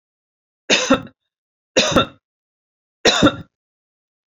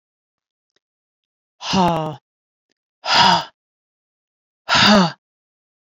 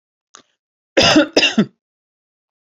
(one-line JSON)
{"three_cough_length": "4.3 s", "three_cough_amplitude": 32767, "three_cough_signal_mean_std_ratio": 0.34, "exhalation_length": "6.0 s", "exhalation_amplitude": 29104, "exhalation_signal_mean_std_ratio": 0.35, "cough_length": "2.7 s", "cough_amplitude": 32767, "cough_signal_mean_std_ratio": 0.35, "survey_phase": "beta (2021-08-13 to 2022-03-07)", "age": "45-64", "gender": "Female", "wearing_mask": "No", "symptom_runny_or_blocked_nose": true, "symptom_sore_throat": true, "symptom_fatigue": true, "smoker_status": "Never smoked", "respiratory_condition_asthma": false, "respiratory_condition_other": false, "recruitment_source": "REACT", "submission_delay": "1 day", "covid_test_result": "Negative", "covid_test_method": "RT-qPCR"}